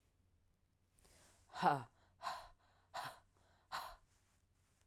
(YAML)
exhalation_length: 4.9 s
exhalation_amplitude: 3371
exhalation_signal_mean_std_ratio: 0.29
survey_phase: alpha (2021-03-01 to 2021-08-12)
age: 45-64
gender: Female
wearing_mask: 'No'
symptom_cough_any: true
symptom_new_continuous_cough: true
symptom_shortness_of_breath: true
symptom_fatigue: true
symptom_headache: true
smoker_status: Never smoked
respiratory_condition_asthma: false
respiratory_condition_other: false
recruitment_source: Test and Trace
submission_delay: 1 day
covid_test_result: Positive
covid_test_method: RT-qPCR
covid_ct_value: 32.3
covid_ct_gene: N gene